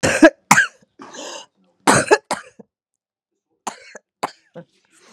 {
  "three_cough_length": "5.1 s",
  "three_cough_amplitude": 32768,
  "three_cough_signal_mean_std_ratio": 0.3,
  "survey_phase": "beta (2021-08-13 to 2022-03-07)",
  "age": "45-64",
  "gender": "Female",
  "wearing_mask": "No",
  "symptom_cough_any": true,
  "symptom_runny_or_blocked_nose": true,
  "symptom_sore_throat": true,
  "symptom_headache": true,
  "symptom_onset": "3 days",
  "smoker_status": "Current smoker (1 to 10 cigarettes per day)",
  "recruitment_source": "Test and Trace",
  "submission_delay": "2 days",
  "covid_test_result": "Positive",
  "covid_test_method": "RT-qPCR",
  "covid_ct_value": 21.6,
  "covid_ct_gene": "ORF1ab gene",
  "covid_ct_mean": 21.8,
  "covid_viral_load": "70000 copies/ml",
  "covid_viral_load_category": "Low viral load (10K-1M copies/ml)"
}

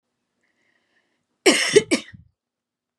{
  "cough_length": "3.0 s",
  "cough_amplitude": 31794,
  "cough_signal_mean_std_ratio": 0.27,
  "survey_phase": "beta (2021-08-13 to 2022-03-07)",
  "age": "18-44",
  "gender": "Female",
  "wearing_mask": "No",
  "symptom_cough_any": true,
  "symptom_runny_or_blocked_nose": true,
  "symptom_onset": "12 days",
  "smoker_status": "Never smoked",
  "respiratory_condition_asthma": false,
  "respiratory_condition_other": false,
  "recruitment_source": "REACT",
  "submission_delay": "1 day",
  "covid_test_result": "Negative",
  "covid_test_method": "RT-qPCR",
  "influenza_a_test_result": "Negative",
  "influenza_b_test_result": "Negative"
}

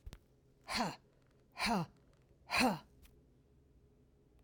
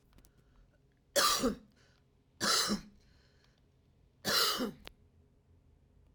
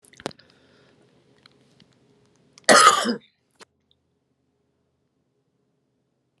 {
  "exhalation_length": "4.4 s",
  "exhalation_amplitude": 3255,
  "exhalation_signal_mean_std_ratio": 0.38,
  "three_cough_length": "6.1 s",
  "three_cough_amplitude": 5634,
  "three_cough_signal_mean_std_ratio": 0.39,
  "cough_length": "6.4 s",
  "cough_amplitude": 32203,
  "cough_signal_mean_std_ratio": 0.2,
  "survey_phase": "alpha (2021-03-01 to 2021-08-12)",
  "age": "65+",
  "gender": "Female",
  "wearing_mask": "No",
  "symptom_none": true,
  "smoker_status": "Never smoked",
  "respiratory_condition_asthma": false,
  "respiratory_condition_other": false,
  "recruitment_source": "REACT",
  "submission_delay": "1 day",
  "covid_test_result": "Negative",
  "covid_test_method": "RT-qPCR"
}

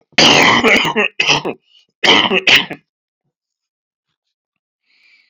{
  "cough_length": "5.3 s",
  "cough_amplitude": 32768,
  "cough_signal_mean_std_ratio": 0.46,
  "survey_phase": "beta (2021-08-13 to 2022-03-07)",
  "age": "65+",
  "gender": "Male",
  "wearing_mask": "No",
  "symptom_cough_any": true,
  "symptom_sore_throat": true,
  "symptom_fatigue": true,
  "symptom_fever_high_temperature": true,
  "symptom_headache": true,
  "symptom_onset": "3 days",
  "smoker_status": "Ex-smoker",
  "respiratory_condition_asthma": false,
  "respiratory_condition_other": false,
  "recruitment_source": "Test and Trace",
  "submission_delay": "2 days",
  "covid_test_result": "Positive",
  "covid_test_method": "RT-qPCR"
}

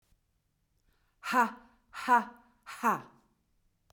{
  "exhalation_length": "3.9 s",
  "exhalation_amplitude": 7745,
  "exhalation_signal_mean_std_ratio": 0.32,
  "survey_phase": "beta (2021-08-13 to 2022-03-07)",
  "age": "45-64",
  "gender": "Female",
  "wearing_mask": "No",
  "symptom_none": true,
  "smoker_status": "Never smoked",
  "respiratory_condition_asthma": false,
  "respiratory_condition_other": false,
  "recruitment_source": "REACT",
  "submission_delay": "1 day",
  "covid_test_result": "Negative",
  "covid_test_method": "RT-qPCR",
  "influenza_a_test_result": "Negative",
  "influenza_b_test_result": "Negative"
}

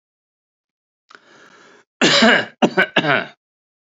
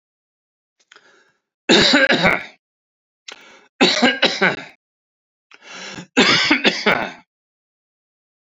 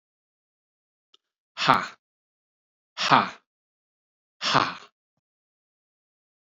{
  "cough_length": "3.8 s",
  "cough_amplitude": 30508,
  "cough_signal_mean_std_ratio": 0.38,
  "three_cough_length": "8.4 s",
  "three_cough_amplitude": 32767,
  "three_cough_signal_mean_std_ratio": 0.41,
  "exhalation_length": "6.5 s",
  "exhalation_amplitude": 27018,
  "exhalation_signal_mean_std_ratio": 0.24,
  "survey_phase": "beta (2021-08-13 to 2022-03-07)",
  "age": "45-64",
  "gender": "Male",
  "wearing_mask": "No",
  "symptom_none": true,
  "smoker_status": "Never smoked",
  "respiratory_condition_asthma": false,
  "respiratory_condition_other": false,
  "recruitment_source": "REACT",
  "submission_delay": "2 days",
  "covid_test_result": "Negative",
  "covid_test_method": "RT-qPCR",
  "influenza_a_test_result": "Negative",
  "influenza_b_test_result": "Negative"
}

